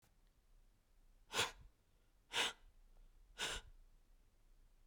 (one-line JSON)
{"exhalation_length": "4.9 s", "exhalation_amplitude": 1977, "exhalation_signal_mean_std_ratio": 0.36, "survey_phase": "beta (2021-08-13 to 2022-03-07)", "age": "18-44", "gender": "Female", "wearing_mask": "No", "symptom_cough_any": true, "smoker_status": "Ex-smoker", "respiratory_condition_asthma": false, "respiratory_condition_other": false, "recruitment_source": "Test and Trace", "submission_delay": "1 day", "covid_test_result": "Negative", "covid_test_method": "RT-qPCR"}